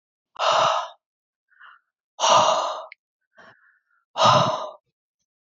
{"exhalation_length": "5.5 s", "exhalation_amplitude": 24504, "exhalation_signal_mean_std_ratio": 0.43, "survey_phase": "alpha (2021-03-01 to 2021-08-12)", "age": "45-64", "gender": "Female", "wearing_mask": "No", "symptom_none": true, "smoker_status": "Ex-smoker", "respiratory_condition_asthma": true, "respiratory_condition_other": false, "recruitment_source": "REACT", "submission_delay": "2 days", "covid_test_result": "Negative", "covid_test_method": "RT-qPCR"}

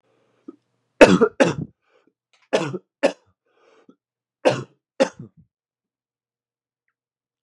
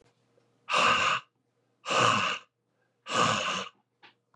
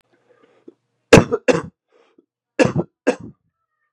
{"three_cough_length": "7.4 s", "three_cough_amplitude": 32768, "three_cough_signal_mean_std_ratio": 0.23, "exhalation_length": "4.4 s", "exhalation_amplitude": 12394, "exhalation_signal_mean_std_ratio": 0.51, "cough_length": "3.9 s", "cough_amplitude": 32768, "cough_signal_mean_std_ratio": 0.26, "survey_phase": "beta (2021-08-13 to 2022-03-07)", "age": "18-44", "gender": "Male", "wearing_mask": "No", "symptom_cough_any": true, "symptom_new_continuous_cough": true, "symptom_fatigue": true, "symptom_headache": true, "symptom_onset": "3 days", "smoker_status": "Ex-smoker", "respiratory_condition_asthma": false, "respiratory_condition_other": false, "recruitment_source": "Test and Trace", "submission_delay": "2 days", "covid_test_result": "Positive", "covid_test_method": "RT-qPCR", "covid_ct_value": 16.9, "covid_ct_gene": "ORF1ab gene"}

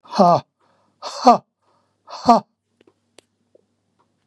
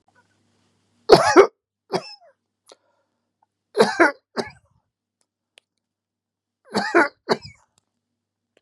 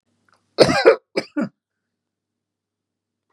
{"exhalation_length": "4.3 s", "exhalation_amplitude": 32767, "exhalation_signal_mean_std_ratio": 0.28, "three_cough_length": "8.6 s", "three_cough_amplitude": 32768, "three_cough_signal_mean_std_ratio": 0.25, "cough_length": "3.3 s", "cough_amplitude": 32768, "cough_signal_mean_std_ratio": 0.27, "survey_phase": "beta (2021-08-13 to 2022-03-07)", "age": "65+", "gender": "Male", "wearing_mask": "No", "symptom_none": true, "smoker_status": "Never smoked", "respiratory_condition_asthma": false, "respiratory_condition_other": false, "recruitment_source": "REACT", "submission_delay": "1 day", "covid_test_result": "Negative", "covid_test_method": "RT-qPCR", "influenza_a_test_result": "Negative", "influenza_b_test_result": "Negative"}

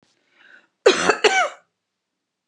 {"cough_length": "2.5 s", "cough_amplitude": 30097, "cough_signal_mean_std_ratio": 0.35, "survey_phase": "beta (2021-08-13 to 2022-03-07)", "age": "45-64", "gender": "Female", "wearing_mask": "No", "symptom_none": true, "smoker_status": "Never smoked", "respiratory_condition_asthma": true, "respiratory_condition_other": false, "recruitment_source": "REACT", "submission_delay": "0 days", "covid_test_result": "Negative", "covid_test_method": "RT-qPCR", "influenza_a_test_result": "Negative", "influenza_b_test_result": "Negative"}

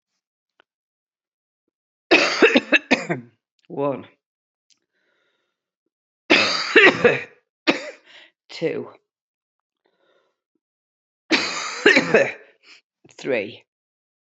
{"three_cough_length": "14.3 s", "three_cough_amplitude": 31132, "three_cough_signal_mean_std_ratio": 0.33, "survey_phase": "beta (2021-08-13 to 2022-03-07)", "age": "45-64", "gender": "Female", "wearing_mask": "No", "symptom_cough_any": true, "symptom_runny_or_blocked_nose": true, "symptom_sore_throat": true, "symptom_abdominal_pain": true, "symptom_fatigue": true, "symptom_onset": "5 days", "smoker_status": "Ex-smoker", "respiratory_condition_asthma": false, "respiratory_condition_other": false, "recruitment_source": "Test and Trace", "submission_delay": "2 days", "covid_test_result": "Positive", "covid_test_method": "RT-qPCR"}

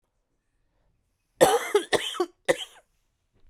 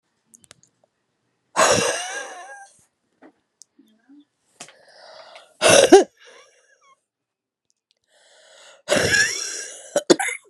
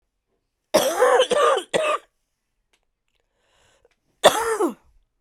{"three_cough_length": "3.5 s", "three_cough_amplitude": 22702, "three_cough_signal_mean_std_ratio": 0.32, "exhalation_length": "10.5 s", "exhalation_amplitude": 32767, "exhalation_signal_mean_std_ratio": 0.3, "cough_length": "5.2 s", "cough_amplitude": 32767, "cough_signal_mean_std_ratio": 0.42, "survey_phase": "beta (2021-08-13 to 2022-03-07)", "age": "18-44", "gender": "Female", "wearing_mask": "No", "symptom_cough_any": true, "symptom_runny_or_blocked_nose": true, "symptom_sore_throat": true, "symptom_fatigue": true, "symptom_headache": true, "symptom_onset": "3 days", "smoker_status": "Ex-smoker", "respiratory_condition_asthma": false, "respiratory_condition_other": false, "recruitment_source": "Test and Trace", "submission_delay": "2 days", "covid_test_result": "Positive", "covid_test_method": "ePCR"}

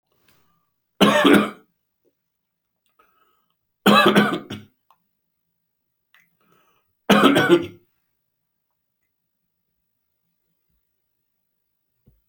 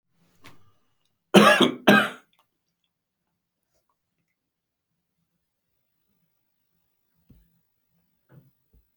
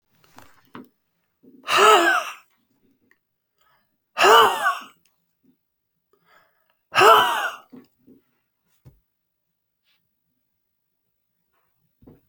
{"three_cough_length": "12.3 s", "three_cough_amplitude": 32392, "three_cough_signal_mean_std_ratio": 0.28, "cough_length": "9.0 s", "cough_amplitude": 27863, "cough_signal_mean_std_ratio": 0.2, "exhalation_length": "12.3 s", "exhalation_amplitude": 28167, "exhalation_signal_mean_std_ratio": 0.28, "survey_phase": "beta (2021-08-13 to 2022-03-07)", "age": "65+", "gender": "Male", "wearing_mask": "No", "symptom_cough_any": true, "symptom_runny_or_blocked_nose": true, "symptom_shortness_of_breath": true, "symptom_headache": true, "symptom_change_to_sense_of_smell_or_taste": true, "symptom_onset": "3 days", "smoker_status": "Never smoked", "respiratory_condition_asthma": false, "respiratory_condition_other": true, "recruitment_source": "Test and Trace", "submission_delay": "2 days", "covid_test_result": "Positive", "covid_test_method": "RT-qPCR", "covid_ct_value": 15.3, "covid_ct_gene": "ORF1ab gene", "covid_ct_mean": 15.6, "covid_viral_load": "7800000 copies/ml", "covid_viral_load_category": "High viral load (>1M copies/ml)"}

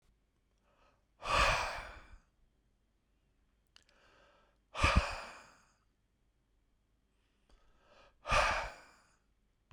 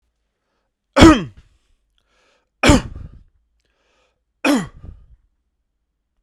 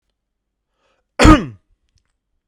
{"exhalation_length": "9.7 s", "exhalation_amplitude": 5760, "exhalation_signal_mean_std_ratio": 0.3, "three_cough_length": "6.2 s", "three_cough_amplitude": 32768, "three_cough_signal_mean_std_ratio": 0.25, "cough_length": "2.5 s", "cough_amplitude": 32768, "cough_signal_mean_std_ratio": 0.24, "survey_phase": "beta (2021-08-13 to 2022-03-07)", "age": "45-64", "gender": "Male", "wearing_mask": "No", "symptom_none": true, "smoker_status": "Ex-smoker", "respiratory_condition_asthma": false, "respiratory_condition_other": false, "recruitment_source": "REACT", "submission_delay": "5 days", "covid_test_result": "Negative", "covid_test_method": "RT-qPCR"}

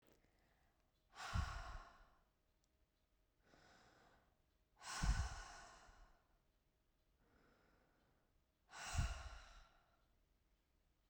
{"exhalation_length": "11.1 s", "exhalation_amplitude": 1186, "exhalation_signal_mean_std_ratio": 0.33, "survey_phase": "beta (2021-08-13 to 2022-03-07)", "age": "45-64", "gender": "Female", "wearing_mask": "No", "symptom_none": true, "smoker_status": "Never smoked", "respiratory_condition_asthma": false, "respiratory_condition_other": false, "recruitment_source": "REACT", "submission_delay": "4 days", "covid_test_result": "Negative", "covid_test_method": "RT-qPCR"}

